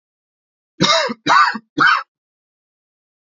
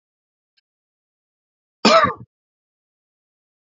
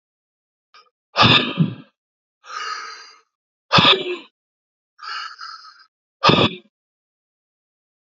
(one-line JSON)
{"three_cough_length": "3.3 s", "three_cough_amplitude": 28569, "three_cough_signal_mean_std_ratio": 0.4, "cough_length": "3.8 s", "cough_amplitude": 31020, "cough_signal_mean_std_ratio": 0.21, "exhalation_length": "8.2 s", "exhalation_amplitude": 30269, "exhalation_signal_mean_std_ratio": 0.33, "survey_phase": "beta (2021-08-13 to 2022-03-07)", "age": "18-44", "gender": "Male", "wearing_mask": "No", "symptom_shortness_of_breath": true, "symptom_fatigue": true, "symptom_onset": "3 days", "smoker_status": "Never smoked", "respiratory_condition_asthma": false, "respiratory_condition_other": false, "recruitment_source": "Test and Trace", "submission_delay": "2 days", "covid_test_result": "Positive", "covid_test_method": "RT-qPCR", "covid_ct_value": 18.4, "covid_ct_gene": "N gene"}